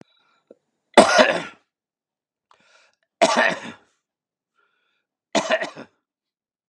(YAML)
three_cough_length: 6.7 s
three_cough_amplitude: 32767
three_cough_signal_mean_std_ratio: 0.28
survey_phase: beta (2021-08-13 to 2022-03-07)
age: 65+
gender: Male
wearing_mask: 'No'
symptom_cough_any: true
symptom_runny_or_blocked_nose: true
symptom_sore_throat: true
symptom_diarrhoea: true
symptom_fatigue: true
symptom_headache: true
symptom_onset: 5 days
smoker_status: Never smoked
respiratory_condition_asthma: false
respiratory_condition_other: false
recruitment_source: Test and Trace
submission_delay: 2 days
covid_test_result: Positive
covid_test_method: ePCR